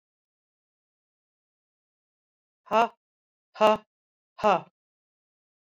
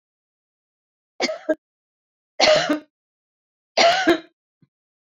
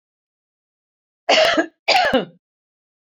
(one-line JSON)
{"exhalation_length": "5.6 s", "exhalation_amplitude": 15202, "exhalation_signal_mean_std_ratio": 0.2, "three_cough_length": "5.0 s", "three_cough_amplitude": 25770, "three_cough_signal_mean_std_ratio": 0.35, "cough_length": "3.1 s", "cough_amplitude": 26803, "cough_signal_mean_std_ratio": 0.4, "survey_phase": "beta (2021-08-13 to 2022-03-07)", "age": "45-64", "gender": "Female", "wearing_mask": "No", "symptom_none": true, "smoker_status": "Never smoked", "respiratory_condition_asthma": false, "respiratory_condition_other": false, "recruitment_source": "REACT", "submission_delay": "1 day", "covid_test_result": "Negative", "covid_test_method": "RT-qPCR"}